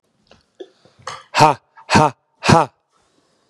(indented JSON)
{
  "exhalation_length": "3.5 s",
  "exhalation_amplitude": 32768,
  "exhalation_signal_mean_std_ratio": 0.32,
  "survey_phase": "beta (2021-08-13 to 2022-03-07)",
  "age": "18-44",
  "gender": "Male",
  "wearing_mask": "No",
  "symptom_none": true,
  "smoker_status": "Ex-smoker",
  "respiratory_condition_asthma": false,
  "respiratory_condition_other": false,
  "recruitment_source": "REACT",
  "submission_delay": "4 days",
  "covid_test_result": "Negative",
  "covid_test_method": "RT-qPCR",
  "influenza_a_test_result": "Negative",
  "influenza_b_test_result": "Negative"
}